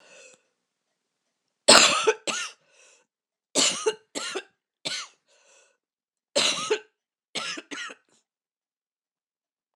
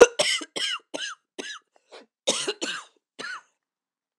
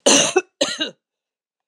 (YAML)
three_cough_length: 9.8 s
three_cough_amplitude: 26028
three_cough_signal_mean_std_ratio: 0.29
cough_length: 4.2 s
cough_amplitude: 26028
cough_signal_mean_std_ratio: 0.31
exhalation_length: 1.7 s
exhalation_amplitude: 26028
exhalation_signal_mean_std_ratio: 0.43
survey_phase: beta (2021-08-13 to 2022-03-07)
age: 65+
gender: Female
wearing_mask: 'No'
symptom_cough_any: true
symptom_runny_or_blocked_nose: true
symptom_fatigue: true
symptom_fever_high_temperature: true
symptom_headache: true
symptom_change_to_sense_of_smell_or_taste: true
symptom_loss_of_taste: true
symptom_onset: 4 days
smoker_status: Ex-smoker
respiratory_condition_asthma: false
respiratory_condition_other: false
recruitment_source: Test and Trace
submission_delay: 1 day
covid_test_result: Positive
covid_test_method: ePCR